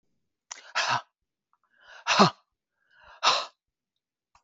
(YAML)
exhalation_length: 4.4 s
exhalation_amplitude: 19641
exhalation_signal_mean_std_ratio: 0.29
survey_phase: beta (2021-08-13 to 2022-03-07)
age: 65+
gender: Female
wearing_mask: 'No'
symptom_none: true
smoker_status: Ex-smoker
respiratory_condition_asthma: false
respiratory_condition_other: false
recruitment_source: REACT
submission_delay: 1 day
covid_test_result: Negative
covid_test_method: RT-qPCR
influenza_a_test_result: Negative
influenza_b_test_result: Negative